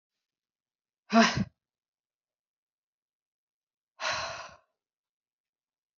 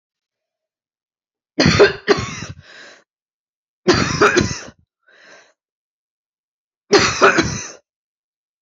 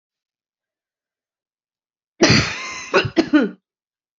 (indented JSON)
{
  "exhalation_length": "6.0 s",
  "exhalation_amplitude": 14020,
  "exhalation_signal_mean_std_ratio": 0.21,
  "three_cough_length": "8.6 s",
  "three_cough_amplitude": 32767,
  "three_cough_signal_mean_std_ratio": 0.35,
  "cough_length": "4.2 s",
  "cough_amplitude": 29609,
  "cough_signal_mean_std_ratio": 0.34,
  "survey_phase": "beta (2021-08-13 to 2022-03-07)",
  "age": "45-64",
  "gender": "Female",
  "wearing_mask": "No",
  "symptom_cough_any": true,
  "symptom_shortness_of_breath": true,
  "symptom_sore_throat": true,
  "symptom_fatigue": true,
  "symptom_other": true,
  "symptom_onset": "4 days",
  "smoker_status": "Never smoked",
  "respiratory_condition_asthma": false,
  "respiratory_condition_other": false,
  "recruitment_source": "Test and Trace",
  "submission_delay": "2 days",
  "covid_test_result": "Positive",
  "covid_test_method": "RT-qPCR",
  "covid_ct_value": 11.8,
  "covid_ct_gene": "ORF1ab gene"
}